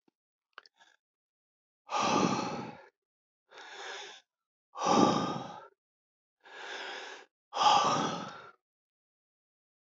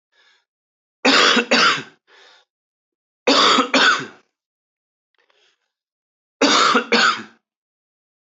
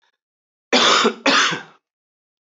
{"exhalation_length": "9.9 s", "exhalation_amplitude": 11580, "exhalation_signal_mean_std_ratio": 0.39, "three_cough_length": "8.4 s", "three_cough_amplitude": 29451, "three_cough_signal_mean_std_ratio": 0.42, "cough_length": "2.6 s", "cough_amplitude": 28415, "cough_signal_mean_std_ratio": 0.45, "survey_phase": "beta (2021-08-13 to 2022-03-07)", "age": "45-64", "gender": "Male", "wearing_mask": "No", "symptom_cough_any": true, "symptom_shortness_of_breath": true, "symptom_sore_throat": true, "symptom_fatigue": true, "symptom_headache": true, "smoker_status": "Never smoked", "respiratory_condition_asthma": false, "respiratory_condition_other": false, "recruitment_source": "Test and Trace", "submission_delay": "2 days", "covid_test_result": "Positive", "covid_test_method": "LFT"}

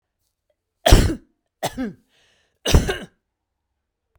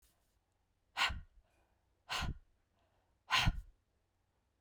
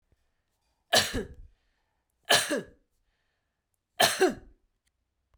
{"cough_length": "4.2 s", "cough_amplitude": 32768, "cough_signal_mean_std_ratio": 0.28, "exhalation_length": "4.6 s", "exhalation_amplitude": 3946, "exhalation_signal_mean_std_ratio": 0.31, "three_cough_length": "5.4 s", "three_cough_amplitude": 14012, "three_cough_signal_mean_std_ratio": 0.3, "survey_phase": "beta (2021-08-13 to 2022-03-07)", "age": "45-64", "gender": "Female", "wearing_mask": "No", "symptom_none": true, "smoker_status": "Never smoked", "respiratory_condition_asthma": false, "respiratory_condition_other": false, "recruitment_source": "REACT", "submission_delay": "2 days", "covid_test_result": "Negative", "covid_test_method": "RT-qPCR"}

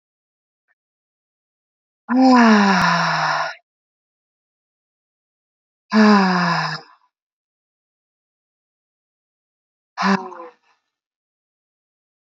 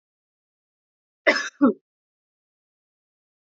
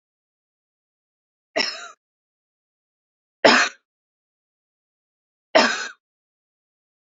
{"exhalation_length": "12.3 s", "exhalation_amplitude": 27806, "exhalation_signal_mean_std_ratio": 0.35, "cough_length": "3.5 s", "cough_amplitude": 26822, "cough_signal_mean_std_ratio": 0.21, "three_cough_length": "7.1 s", "three_cough_amplitude": 32767, "three_cough_signal_mean_std_ratio": 0.22, "survey_phase": "beta (2021-08-13 to 2022-03-07)", "age": "45-64", "gender": "Female", "wearing_mask": "No", "symptom_runny_or_blocked_nose": true, "symptom_sore_throat": true, "symptom_headache": true, "smoker_status": "Never smoked", "respiratory_condition_asthma": false, "respiratory_condition_other": false, "recruitment_source": "Test and Trace", "submission_delay": "0 days", "covid_test_result": "Negative", "covid_test_method": "LFT"}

